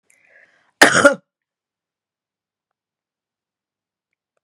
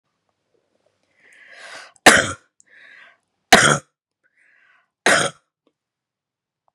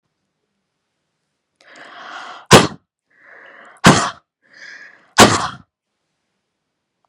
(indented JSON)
{
  "cough_length": "4.4 s",
  "cough_amplitude": 32768,
  "cough_signal_mean_std_ratio": 0.19,
  "three_cough_length": "6.7 s",
  "three_cough_amplitude": 32768,
  "three_cough_signal_mean_std_ratio": 0.24,
  "exhalation_length": "7.1 s",
  "exhalation_amplitude": 32768,
  "exhalation_signal_mean_std_ratio": 0.24,
  "survey_phase": "beta (2021-08-13 to 2022-03-07)",
  "age": "45-64",
  "gender": "Female",
  "wearing_mask": "No",
  "symptom_fatigue": true,
  "symptom_change_to_sense_of_smell_or_taste": true,
  "symptom_other": true,
  "symptom_onset": "7 days",
  "smoker_status": "Never smoked",
  "respiratory_condition_asthma": true,
  "respiratory_condition_other": false,
  "recruitment_source": "Test and Trace",
  "submission_delay": "3 days",
  "covid_test_result": "Negative",
  "covid_test_method": "RT-qPCR"
}